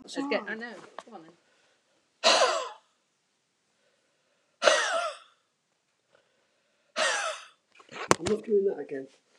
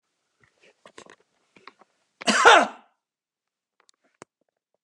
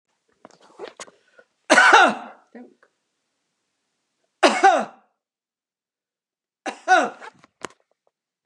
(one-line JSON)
{"exhalation_length": "9.4 s", "exhalation_amplitude": 29179, "exhalation_signal_mean_std_ratio": 0.39, "cough_length": "4.8 s", "cough_amplitude": 29203, "cough_signal_mean_std_ratio": 0.21, "three_cough_length": "8.5 s", "three_cough_amplitude": 29203, "three_cough_signal_mean_std_ratio": 0.28, "survey_phase": "beta (2021-08-13 to 2022-03-07)", "age": "65+", "gender": "Male", "wearing_mask": "No", "symptom_none": true, "smoker_status": "Never smoked", "respiratory_condition_asthma": false, "respiratory_condition_other": true, "recruitment_source": "REACT", "submission_delay": "2 days", "covid_test_result": "Negative", "covid_test_method": "RT-qPCR", "influenza_a_test_result": "Negative", "influenza_b_test_result": "Negative"}